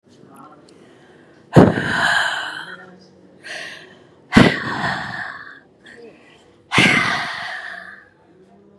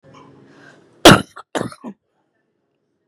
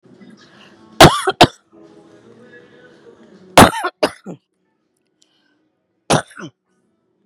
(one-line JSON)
{"exhalation_length": "8.8 s", "exhalation_amplitude": 32768, "exhalation_signal_mean_std_ratio": 0.41, "cough_length": "3.1 s", "cough_amplitude": 32768, "cough_signal_mean_std_ratio": 0.21, "three_cough_length": "7.3 s", "three_cough_amplitude": 32768, "three_cough_signal_mean_std_ratio": 0.24, "survey_phase": "beta (2021-08-13 to 2022-03-07)", "age": "65+", "gender": "Female", "wearing_mask": "No", "symptom_cough_any": true, "symptom_shortness_of_breath": true, "symptom_fatigue": true, "symptom_onset": "10 days", "smoker_status": "Ex-smoker", "respiratory_condition_asthma": true, "respiratory_condition_other": false, "recruitment_source": "REACT", "submission_delay": "3 days", "covid_test_result": "Negative", "covid_test_method": "RT-qPCR", "influenza_a_test_result": "Negative", "influenza_b_test_result": "Negative"}